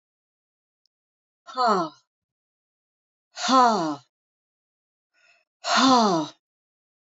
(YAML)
exhalation_length: 7.2 s
exhalation_amplitude: 19269
exhalation_signal_mean_std_ratio: 0.35
survey_phase: alpha (2021-03-01 to 2021-08-12)
age: 45-64
gender: Female
wearing_mask: 'No'
symptom_none: true
smoker_status: Never smoked
respiratory_condition_asthma: false
respiratory_condition_other: false
recruitment_source: REACT
submission_delay: 1 day
covid_test_result: Negative
covid_test_method: RT-qPCR